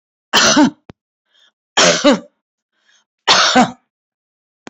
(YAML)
three_cough_length: 4.7 s
three_cough_amplitude: 32768
three_cough_signal_mean_std_ratio: 0.41
survey_phase: alpha (2021-03-01 to 2021-08-12)
age: 65+
gender: Female
wearing_mask: 'No'
symptom_none: true
smoker_status: Current smoker (1 to 10 cigarettes per day)
respiratory_condition_asthma: false
respiratory_condition_other: false
recruitment_source: REACT
submission_delay: 1 day
covid_test_result: Negative
covid_test_method: RT-qPCR